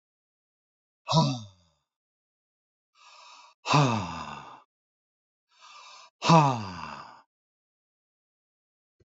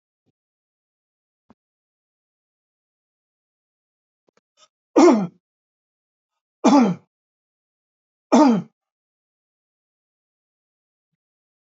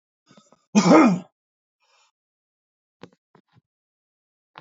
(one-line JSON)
{"exhalation_length": "9.1 s", "exhalation_amplitude": 15993, "exhalation_signal_mean_std_ratio": 0.29, "three_cough_length": "11.8 s", "three_cough_amplitude": 25582, "three_cough_signal_mean_std_ratio": 0.22, "cough_length": "4.6 s", "cough_amplitude": 22794, "cough_signal_mean_std_ratio": 0.24, "survey_phase": "beta (2021-08-13 to 2022-03-07)", "age": "65+", "gender": "Male", "wearing_mask": "No", "symptom_none": true, "smoker_status": "Never smoked", "respiratory_condition_asthma": false, "respiratory_condition_other": false, "recruitment_source": "REACT", "submission_delay": "3 days", "covid_test_result": "Negative", "covid_test_method": "RT-qPCR", "influenza_a_test_result": "Negative", "influenza_b_test_result": "Negative"}